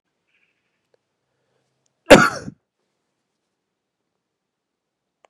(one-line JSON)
{"cough_length": "5.3 s", "cough_amplitude": 32768, "cough_signal_mean_std_ratio": 0.15, "survey_phase": "beta (2021-08-13 to 2022-03-07)", "age": "45-64", "gender": "Male", "wearing_mask": "No", "symptom_cough_any": true, "symptom_runny_or_blocked_nose": true, "symptom_sore_throat": true, "symptom_fatigue": true, "symptom_change_to_sense_of_smell_or_taste": true, "symptom_onset": "6 days", "smoker_status": "Never smoked", "respiratory_condition_asthma": false, "respiratory_condition_other": false, "recruitment_source": "Test and Trace", "submission_delay": "1 day", "covid_test_result": "Positive", "covid_test_method": "RT-qPCR", "covid_ct_value": 27.2, "covid_ct_gene": "ORF1ab gene", "covid_ct_mean": 28.1, "covid_viral_load": "610 copies/ml", "covid_viral_load_category": "Minimal viral load (< 10K copies/ml)"}